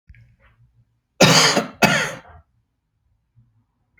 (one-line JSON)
{"cough_length": "4.0 s", "cough_amplitude": 31568, "cough_signal_mean_std_ratio": 0.34, "survey_phase": "alpha (2021-03-01 to 2021-08-12)", "age": "45-64", "gender": "Male", "wearing_mask": "No", "symptom_shortness_of_breath": true, "symptom_fatigue": true, "symptom_onset": "12 days", "smoker_status": "Ex-smoker", "respiratory_condition_asthma": false, "respiratory_condition_other": false, "recruitment_source": "REACT", "submission_delay": "2 days", "covid_test_result": "Negative", "covid_test_method": "RT-qPCR"}